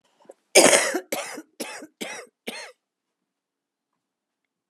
{"three_cough_length": "4.7 s", "three_cough_amplitude": 32538, "three_cough_signal_mean_std_ratio": 0.28, "survey_phase": "alpha (2021-03-01 to 2021-08-12)", "age": "65+", "gender": "Female", "wearing_mask": "No", "symptom_cough_any": true, "symptom_fatigue": true, "symptom_headache": true, "smoker_status": "Never smoked", "respiratory_condition_asthma": false, "respiratory_condition_other": false, "recruitment_source": "Test and Trace", "submission_delay": "2 days", "covid_test_result": "Positive", "covid_test_method": "RT-qPCR", "covid_ct_value": 12.7, "covid_ct_gene": "ORF1ab gene", "covid_ct_mean": 13.0, "covid_viral_load": "53000000 copies/ml", "covid_viral_load_category": "High viral load (>1M copies/ml)"}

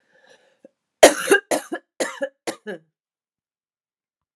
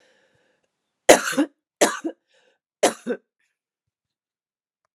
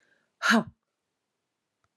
{"cough_length": "4.4 s", "cough_amplitude": 32768, "cough_signal_mean_std_ratio": 0.24, "three_cough_length": "4.9 s", "three_cough_amplitude": 32768, "three_cough_signal_mean_std_ratio": 0.23, "exhalation_length": "2.0 s", "exhalation_amplitude": 10345, "exhalation_signal_mean_std_ratio": 0.25, "survey_phase": "alpha (2021-03-01 to 2021-08-12)", "age": "45-64", "gender": "Female", "wearing_mask": "No", "symptom_cough_any": true, "symptom_change_to_sense_of_smell_or_taste": true, "symptom_loss_of_taste": true, "symptom_onset": "3 days", "smoker_status": "Never smoked", "respiratory_condition_asthma": false, "respiratory_condition_other": false, "recruitment_source": "Test and Trace", "submission_delay": "2 days", "covid_test_result": "Positive", "covid_test_method": "RT-qPCR", "covid_ct_value": 14.3, "covid_ct_gene": "N gene", "covid_ct_mean": 14.6, "covid_viral_load": "17000000 copies/ml", "covid_viral_load_category": "High viral load (>1M copies/ml)"}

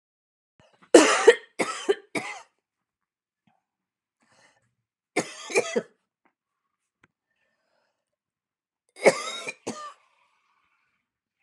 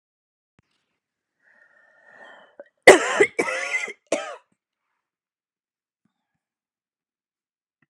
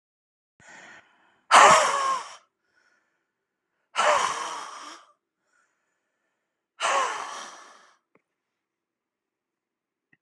{"three_cough_length": "11.4 s", "three_cough_amplitude": 32376, "three_cough_signal_mean_std_ratio": 0.22, "cough_length": "7.9 s", "cough_amplitude": 32768, "cough_signal_mean_std_ratio": 0.19, "exhalation_length": "10.2 s", "exhalation_amplitude": 27549, "exhalation_signal_mean_std_ratio": 0.29, "survey_phase": "beta (2021-08-13 to 2022-03-07)", "age": "45-64", "gender": "Female", "wearing_mask": "No", "symptom_cough_any": true, "symptom_headache": true, "smoker_status": "Never smoked", "respiratory_condition_asthma": true, "respiratory_condition_other": false, "recruitment_source": "REACT", "submission_delay": "1 day", "covid_test_result": "Negative", "covid_test_method": "RT-qPCR", "influenza_a_test_result": "Unknown/Void", "influenza_b_test_result": "Unknown/Void"}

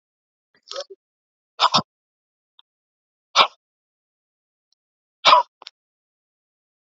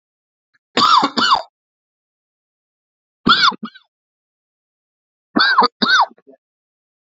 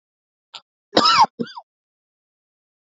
{"exhalation_length": "6.9 s", "exhalation_amplitude": 32767, "exhalation_signal_mean_std_ratio": 0.2, "three_cough_length": "7.2 s", "three_cough_amplitude": 29506, "three_cough_signal_mean_std_ratio": 0.36, "cough_length": "2.9 s", "cough_amplitude": 31790, "cough_signal_mean_std_ratio": 0.28, "survey_phase": "beta (2021-08-13 to 2022-03-07)", "age": "18-44", "gender": "Male", "wearing_mask": "No", "symptom_none": true, "smoker_status": "Never smoked", "respiratory_condition_asthma": false, "respiratory_condition_other": false, "recruitment_source": "REACT", "submission_delay": "8 days", "covid_test_result": "Negative", "covid_test_method": "RT-qPCR"}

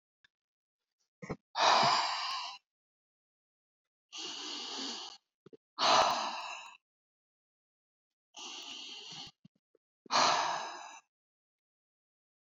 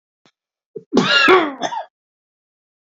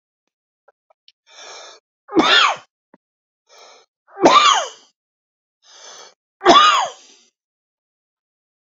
{"exhalation_length": "12.5 s", "exhalation_amplitude": 6936, "exhalation_signal_mean_std_ratio": 0.38, "cough_length": "3.0 s", "cough_amplitude": 31433, "cough_signal_mean_std_ratio": 0.39, "three_cough_length": "8.6 s", "three_cough_amplitude": 30021, "three_cough_signal_mean_std_ratio": 0.32, "survey_phase": "beta (2021-08-13 to 2022-03-07)", "age": "65+", "gender": "Male", "wearing_mask": "No", "symptom_none": true, "smoker_status": "Never smoked", "respiratory_condition_asthma": false, "respiratory_condition_other": false, "recruitment_source": "REACT", "submission_delay": "2 days", "covid_test_result": "Negative", "covid_test_method": "RT-qPCR", "influenza_a_test_result": "Negative", "influenza_b_test_result": "Negative"}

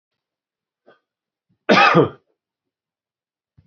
{"cough_length": "3.7 s", "cough_amplitude": 28271, "cough_signal_mean_std_ratio": 0.26, "survey_phase": "beta (2021-08-13 to 2022-03-07)", "age": "45-64", "gender": "Male", "wearing_mask": "No", "symptom_none": true, "smoker_status": "Ex-smoker", "respiratory_condition_asthma": false, "respiratory_condition_other": false, "recruitment_source": "REACT", "submission_delay": "2 days", "covid_test_result": "Negative", "covid_test_method": "RT-qPCR", "influenza_a_test_result": "Negative", "influenza_b_test_result": "Negative"}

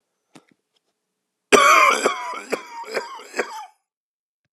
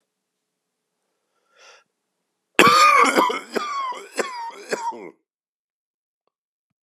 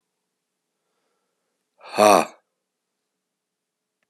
{"three_cough_length": "4.5 s", "three_cough_amplitude": 32768, "three_cough_signal_mean_std_ratio": 0.37, "cough_length": "6.8 s", "cough_amplitude": 32768, "cough_signal_mean_std_ratio": 0.35, "exhalation_length": "4.1 s", "exhalation_amplitude": 31547, "exhalation_signal_mean_std_ratio": 0.19, "survey_phase": "beta (2021-08-13 to 2022-03-07)", "age": "45-64", "gender": "Male", "wearing_mask": "No", "symptom_cough_any": true, "symptom_runny_or_blocked_nose": true, "symptom_shortness_of_breath": true, "symptom_sore_throat": true, "symptom_fatigue": true, "symptom_headache": true, "smoker_status": "Ex-smoker", "respiratory_condition_asthma": true, "respiratory_condition_other": false, "recruitment_source": "Test and Trace", "submission_delay": "2 days", "covid_test_result": "Positive", "covid_test_method": "RT-qPCR", "covid_ct_value": 23.9, "covid_ct_gene": "ORF1ab gene", "covid_ct_mean": 24.4, "covid_viral_load": "10000 copies/ml", "covid_viral_load_category": "Low viral load (10K-1M copies/ml)"}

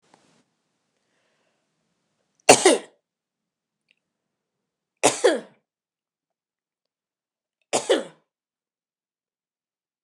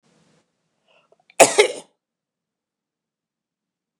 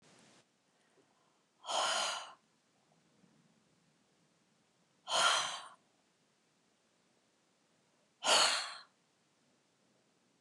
{"three_cough_length": "10.0 s", "three_cough_amplitude": 29204, "three_cough_signal_mean_std_ratio": 0.19, "cough_length": "4.0 s", "cough_amplitude": 29204, "cough_signal_mean_std_ratio": 0.18, "exhalation_length": "10.4 s", "exhalation_amplitude": 5954, "exhalation_signal_mean_std_ratio": 0.3, "survey_phase": "beta (2021-08-13 to 2022-03-07)", "age": "65+", "gender": "Female", "wearing_mask": "No", "symptom_none": true, "smoker_status": "Never smoked", "respiratory_condition_asthma": true, "respiratory_condition_other": false, "recruitment_source": "REACT", "submission_delay": "2 days", "covid_test_result": "Negative", "covid_test_method": "RT-qPCR", "influenza_a_test_result": "Negative", "influenza_b_test_result": "Negative"}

